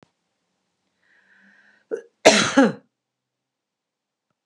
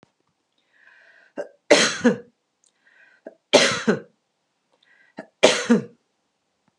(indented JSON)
{
  "cough_length": "4.5 s",
  "cough_amplitude": 32768,
  "cough_signal_mean_std_ratio": 0.23,
  "three_cough_length": "6.8 s",
  "three_cough_amplitude": 31841,
  "three_cough_signal_mean_std_ratio": 0.3,
  "survey_phase": "beta (2021-08-13 to 2022-03-07)",
  "age": "65+",
  "gender": "Female",
  "wearing_mask": "No",
  "symptom_none": true,
  "smoker_status": "Ex-smoker",
  "respiratory_condition_asthma": false,
  "respiratory_condition_other": false,
  "recruitment_source": "REACT",
  "submission_delay": "2 days",
  "covid_test_result": "Negative",
  "covid_test_method": "RT-qPCR",
  "influenza_a_test_result": "Negative",
  "influenza_b_test_result": "Negative"
}